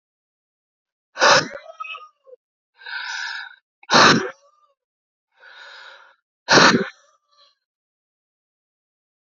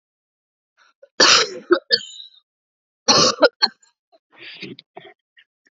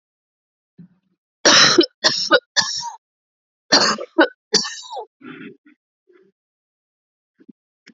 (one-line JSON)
{"exhalation_length": "9.3 s", "exhalation_amplitude": 31187, "exhalation_signal_mean_std_ratio": 0.29, "cough_length": "5.7 s", "cough_amplitude": 31115, "cough_signal_mean_std_ratio": 0.31, "three_cough_length": "7.9 s", "three_cough_amplitude": 32606, "three_cough_signal_mean_std_ratio": 0.33, "survey_phase": "alpha (2021-03-01 to 2021-08-12)", "age": "18-44", "gender": "Female", "wearing_mask": "No", "symptom_cough_any": true, "symptom_new_continuous_cough": true, "symptom_shortness_of_breath": true, "symptom_fatigue": true, "symptom_fever_high_temperature": true, "symptom_change_to_sense_of_smell_or_taste": true, "symptom_onset": "2 days", "smoker_status": "Never smoked", "respiratory_condition_asthma": false, "respiratory_condition_other": false, "recruitment_source": "Test and Trace", "submission_delay": "2 days", "covid_test_result": "Positive", "covid_test_method": "RT-qPCR"}